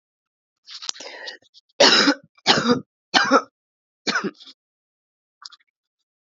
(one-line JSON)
{"three_cough_length": "6.2 s", "three_cough_amplitude": 30021, "three_cough_signal_mean_std_ratio": 0.34, "survey_phase": "alpha (2021-03-01 to 2021-08-12)", "age": "18-44", "gender": "Female", "wearing_mask": "Yes", "symptom_cough_any": true, "symptom_new_continuous_cough": true, "symptom_shortness_of_breath": true, "symptom_abdominal_pain": true, "symptom_fatigue": true, "symptom_fever_high_temperature": true, "symptom_headache": true, "symptom_change_to_sense_of_smell_or_taste": true, "symptom_loss_of_taste": true, "smoker_status": "Current smoker (1 to 10 cigarettes per day)", "respiratory_condition_asthma": false, "respiratory_condition_other": false, "recruitment_source": "Test and Trace", "submission_delay": "2 days", "covid_test_result": "Positive", "covid_test_method": "LFT"}